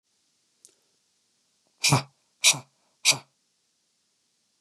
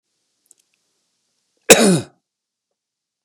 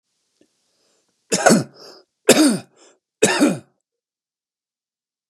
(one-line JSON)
{"exhalation_length": "4.6 s", "exhalation_amplitude": 20042, "exhalation_signal_mean_std_ratio": 0.23, "cough_length": "3.2 s", "cough_amplitude": 32768, "cough_signal_mean_std_ratio": 0.23, "three_cough_length": "5.3 s", "three_cough_amplitude": 32768, "three_cough_signal_mean_std_ratio": 0.33, "survey_phase": "beta (2021-08-13 to 2022-03-07)", "age": "45-64", "gender": "Male", "wearing_mask": "No", "symptom_cough_any": true, "symptom_runny_or_blocked_nose": true, "symptom_other": true, "smoker_status": "Never smoked", "respiratory_condition_asthma": true, "respiratory_condition_other": false, "recruitment_source": "Test and Trace", "submission_delay": "1 day", "covid_test_result": "Positive", "covid_test_method": "ePCR"}